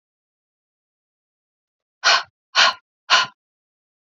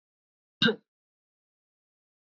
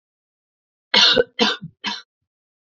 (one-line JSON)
{"exhalation_length": "4.0 s", "exhalation_amplitude": 28794, "exhalation_signal_mean_std_ratio": 0.27, "cough_length": "2.2 s", "cough_amplitude": 9865, "cough_signal_mean_std_ratio": 0.18, "three_cough_length": "2.6 s", "three_cough_amplitude": 29568, "three_cough_signal_mean_std_ratio": 0.35, "survey_phase": "beta (2021-08-13 to 2022-03-07)", "age": "18-44", "gender": "Female", "wearing_mask": "No", "symptom_runny_or_blocked_nose": true, "symptom_fatigue": true, "symptom_change_to_sense_of_smell_or_taste": true, "symptom_onset": "5 days", "smoker_status": "Never smoked", "respiratory_condition_asthma": false, "respiratory_condition_other": false, "recruitment_source": "Test and Trace", "submission_delay": "2 days", "covid_test_result": "Positive", "covid_test_method": "RT-qPCR", "covid_ct_value": 17.7, "covid_ct_gene": "ORF1ab gene"}